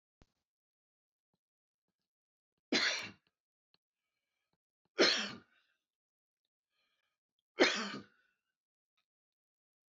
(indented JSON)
{
  "three_cough_length": "9.9 s",
  "three_cough_amplitude": 6449,
  "three_cough_signal_mean_std_ratio": 0.22,
  "survey_phase": "beta (2021-08-13 to 2022-03-07)",
  "age": "65+",
  "gender": "Male",
  "wearing_mask": "No",
  "symptom_none": true,
  "smoker_status": "Ex-smoker",
  "respiratory_condition_asthma": false,
  "respiratory_condition_other": false,
  "recruitment_source": "REACT",
  "submission_delay": "3 days",
  "covid_test_result": "Negative",
  "covid_test_method": "RT-qPCR",
  "influenza_a_test_result": "Negative",
  "influenza_b_test_result": "Negative"
}